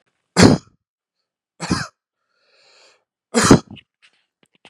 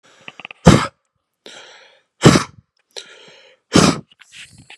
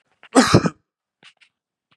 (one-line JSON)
{"three_cough_length": "4.7 s", "three_cough_amplitude": 32768, "three_cough_signal_mean_std_ratio": 0.26, "exhalation_length": "4.8 s", "exhalation_amplitude": 32768, "exhalation_signal_mean_std_ratio": 0.28, "cough_length": "2.0 s", "cough_amplitude": 32768, "cough_signal_mean_std_ratio": 0.29, "survey_phase": "beta (2021-08-13 to 2022-03-07)", "age": "18-44", "gender": "Male", "wearing_mask": "No", "symptom_cough_any": true, "smoker_status": "Never smoked", "respiratory_condition_asthma": false, "respiratory_condition_other": false, "recruitment_source": "Test and Trace", "submission_delay": "2 days", "covid_test_result": "Positive", "covid_test_method": "LFT"}